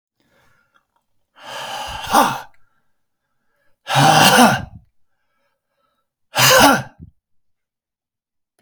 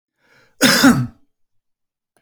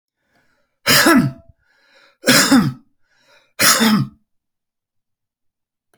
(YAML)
exhalation_length: 8.6 s
exhalation_amplitude: 32768
exhalation_signal_mean_std_ratio: 0.35
cough_length: 2.2 s
cough_amplitude: 32767
cough_signal_mean_std_ratio: 0.36
three_cough_length: 6.0 s
three_cough_amplitude: 32768
three_cough_signal_mean_std_ratio: 0.4
survey_phase: beta (2021-08-13 to 2022-03-07)
age: 45-64
gender: Male
wearing_mask: 'No'
symptom_none: true
smoker_status: Ex-smoker
respiratory_condition_asthma: false
respiratory_condition_other: false
recruitment_source: REACT
submission_delay: 1 day
covid_test_result: Negative
covid_test_method: RT-qPCR